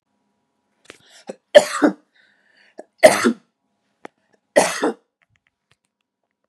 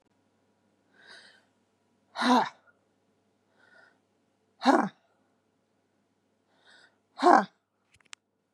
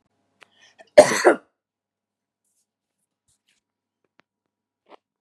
three_cough_length: 6.5 s
three_cough_amplitude: 32768
three_cough_signal_mean_std_ratio: 0.24
exhalation_length: 8.5 s
exhalation_amplitude: 20149
exhalation_signal_mean_std_ratio: 0.22
cough_length: 5.2 s
cough_amplitude: 32768
cough_signal_mean_std_ratio: 0.16
survey_phase: beta (2021-08-13 to 2022-03-07)
age: 45-64
gender: Female
wearing_mask: 'No'
symptom_runny_or_blocked_nose: true
symptom_other: true
smoker_status: Never smoked
respiratory_condition_asthma: false
respiratory_condition_other: false
recruitment_source: Test and Trace
submission_delay: 1 day
covid_test_result: Positive
covid_test_method: RT-qPCR
covid_ct_value: 23.2
covid_ct_gene: ORF1ab gene
covid_ct_mean: 23.3
covid_viral_load: 23000 copies/ml
covid_viral_load_category: Low viral load (10K-1M copies/ml)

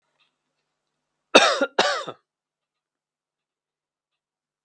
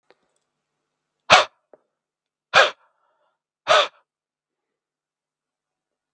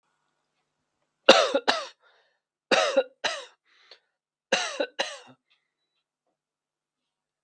cough_length: 4.6 s
cough_amplitude: 32767
cough_signal_mean_std_ratio: 0.23
exhalation_length: 6.1 s
exhalation_amplitude: 32768
exhalation_signal_mean_std_ratio: 0.21
three_cough_length: 7.4 s
three_cough_amplitude: 32768
three_cough_signal_mean_std_ratio: 0.27
survey_phase: beta (2021-08-13 to 2022-03-07)
age: 18-44
gender: Male
wearing_mask: 'No'
symptom_none: true
smoker_status: Never smoked
respiratory_condition_asthma: false
respiratory_condition_other: false
recruitment_source: REACT
submission_delay: 5 days
covid_test_result: Negative
covid_test_method: RT-qPCR
influenza_a_test_result: Unknown/Void
influenza_b_test_result: Unknown/Void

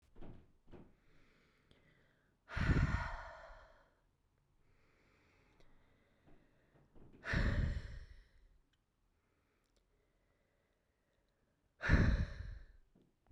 exhalation_length: 13.3 s
exhalation_amplitude: 3910
exhalation_signal_mean_std_ratio: 0.32
survey_phase: beta (2021-08-13 to 2022-03-07)
age: 18-44
gender: Female
wearing_mask: 'No'
symptom_runny_or_blocked_nose: true
symptom_onset: 2 days
smoker_status: Never smoked
respiratory_condition_asthma: false
respiratory_condition_other: false
recruitment_source: Test and Trace
submission_delay: 1 day
covid_test_result: Positive
covid_test_method: RT-qPCR
covid_ct_value: 17.3
covid_ct_gene: ORF1ab gene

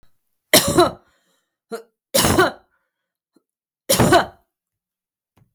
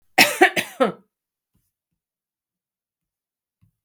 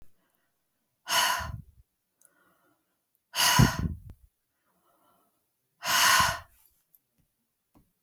three_cough_length: 5.5 s
three_cough_amplitude: 32768
three_cough_signal_mean_std_ratio: 0.34
cough_length: 3.8 s
cough_amplitude: 32768
cough_signal_mean_std_ratio: 0.24
exhalation_length: 8.0 s
exhalation_amplitude: 14006
exhalation_signal_mean_std_ratio: 0.33
survey_phase: beta (2021-08-13 to 2022-03-07)
age: 45-64
gender: Female
wearing_mask: 'No'
symptom_none: true
smoker_status: Never smoked
respiratory_condition_asthma: false
respiratory_condition_other: false
recruitment_source: REACT
submission_delay: 15 days
covid_test_result: Positive
covid_test_method: RT-qPCR
covid_ct_value: 32.0
covid_ct_gene: E gene
influenza_a_test_result: Unknown/Void
influenza_b_test_result: Unknown/Void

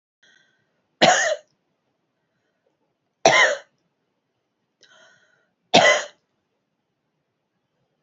three_cough_length: 8.0 s
three_cough_amplitude: 32767
three_cough_signal_mean_std_ratio: 0.26
survey_phase: beta (2021-08-13 to 2022-03-07)
age: 45-64
gender: Female
wearing_mask: 'No'
symptom_runny_or_blocked_nose: true
symptom_headache: true
smoker_status: Never smoked
respiratory_condition_asthma: true
respiratory_condition_other: false
recruitment_source: Test and Trace
submission_delay: 3 days
covid_test_result: Negative
covid_test_method: RT-qPCR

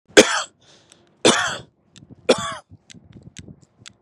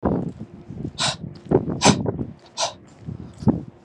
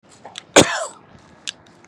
three_cough_length: 4.0 s
three_cough_amplitude: 32768
three_cough_signal_mean_std_ratio: 0.29
exhalation_length: 3.8 s
exhalation_amplitude: 27288
exhalation_signal_mean_std_ratio: 0.52
cough_length: 1.9 s
cough_amplitude: 32768
cough_signal_mean_std_ratio: 0.27
survey_phase: beta (2021-08-13 to 2022-03-07)
age: 18-44
gender: Male
wearing_mask: 'No'
symptom_none: true
symptom_onset: 13 days
smoker_status: Ex-smoker
respiratory_condition_asthma: false
respiratory_condition_other: false
recruitment_source: REACT
submission_delay: 2 days
covid_test_result: Negative
covid_test_method: RT-qPCR
influenza_a_test_result: Negative
influenza_b_test_result: Negative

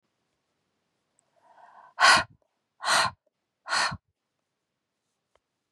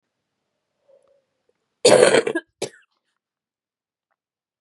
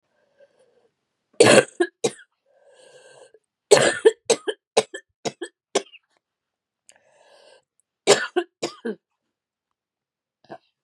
exhalation_length: 5.7 s
exhalation_amplitude: 20093
exhalation_signal_mean_std_ratio: 0.27
cough_length: 4.6 s
cough_amplitude: 32470
cough_signal_mean_std_ratio: 0.25
three_cough_length: 10.8 s
three_cough_amplitude: 32768
three_cough_signal_mean_std_ratio: 0.25
survey_phase: beta (2021-08-13 to 2022-03-07)
age: 45-64
gender: Female
wearing_mask: 'No'
symptom_cough_any: true
symptom_runny_or_blocked_nose: true
symptom_sore_throat: true
symptom_abdominal_pain: true
symptom_diarrhoea: true
symptom_headache: true
symptom_change_to_sense_of_smell_or_taste: true
symptom_onset: 3 days
smoker_status: Ex-smoker
respiratory_condition_asthma: false
respiratory_condition_other: false
recruitment_source: Test and Trace
submission_delay: 1 day
covid_test_result: Positive
covid_test_method: RT-qPCR
covid_ct_value: 23.8
covid_ct_gene: N gene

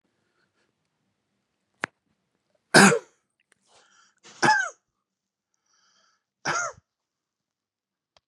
three_cough_length: 8.3 s
three_cough_amplitude: 29514
three_cough_signal_mean_std_ratio: 0.21
survey_phase: beta (2021-08-13 to 2022-03-07)
age: 65+
gender: Male
wearing_mask: 'No'
symptom_none: true
smoker_status: Ex-smoker
respiratory_condition_asthma: false
respiratory_condition_other: false
recruitment_source: REACT
submission_delay: 3 days
covid_test_result: Negative
covid_test_method: RT-qPCR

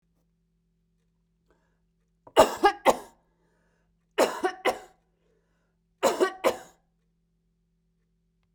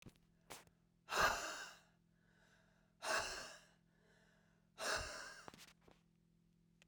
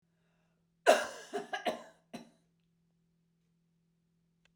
three_cough_length: 8.5 s
three_cough_amplitude: 23886
three_cough_signal_mean_std_ratio: 0.26
exhalation_length: 6.9 s
exhalation_amplitude: 2410
exhalation_signal_mean_std_ratio: 0.38
cough_length: 4.6 s
cough_amplitude: 11044
cough_signal_mean_std_ratio: 0.23
survey_phase: beta (2021-08-13 to 2022-03-07)
age: 45-64
gender: Female
wearing_mask: 'No'
symptom_none: true
smoker_status: Never smoked
respiratory_condition_asthma: false
respiratory_condition_other: false
recruitment_source: REACT
submission_delay: 3 days
covid_test_result: Negative
covid_test_method: RT-qPCR
influenza_a_test_result: Negative
influenza_b_test_result: Negative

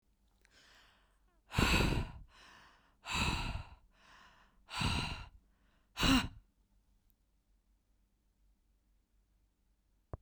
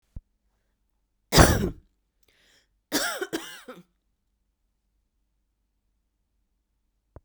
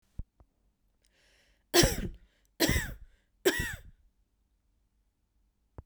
exhalation_length: 10.2 s
exhalation_amplitude: 5140
exhalation_signal_mean_std_ratio: 0.35
cough_length: 7.2 s
cough_amplitude: 32767
cough_signal_mean_std_ratio: 0.22
three_cough_length: 5.9 s
three_cough_amplitude: 11706
three_cough_signal_mean_std_ratio: 0.29
survey_phase: beta (2021-08-13 to 2022-03-07)
age: 45-64
gender: Female
wearing_mask: 'No'
symptom_none: true
smoker_status: Ex-smoker
respiratory_condition_asthma: false
respiratory_condition_other: false
recruitment_source: REACT
submission_delay: 2 days
covid_test_result: Negative
covid_test_method: RT-qPCR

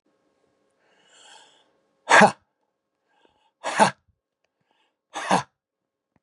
exhalation_length: 6.2 s
exhalation_amplitude: 30248
exhalation_signal_mean_std_ratio: 0.22
survey_phase: beta (2021-08-13 to 2022-03-07)
age: 45-64
gender: Male
wearing_mask: 'No'
symptom_cough_any: true
symptom_sore_throat: true
symptom_onset: 7 days
smoker_status: Ex-smoker
recruitment_source: Test and Trace
submission_delay: 3 days
covid_test_result: Negative
covid_test_method: RT-qPCR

